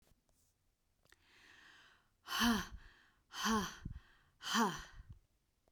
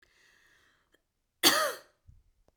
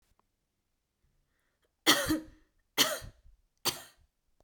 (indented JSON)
{
  "exhalation_length": "5.7 s",
  "exhalation_amplitude": 3253,
  "exhalation_signal_mean_std_ratio": 0.39,
  "cough_length": "2.6 s",
  "cough_amplitude": 14440,
  "cough_signal_mean_std_ratio": 0.26,
  "three_cough_length": "4.4 s",
  "three_cough_amplitude": 11138,
  "three_cough_signal_mean_std_ratio": 0.28,
  "survey_phase": "beta (2021-08-13 to 2022-03-07)",
  "age": "18-44",
  "gender": "Female",
  "wearing_mask": "No",
  "symptom_none": true,
  "symptom_onset": "5 days",
  "smoker_status": "Never smoked",
  "respiratory_condition_asthma": false,
  "respiratory_condition_other": false,
  "recruitment_source": "REACT",
  "submission_delay": "2 days",
  "covid_test_result": "Negative",
  "covid_test_method": "RT-qPCR"
}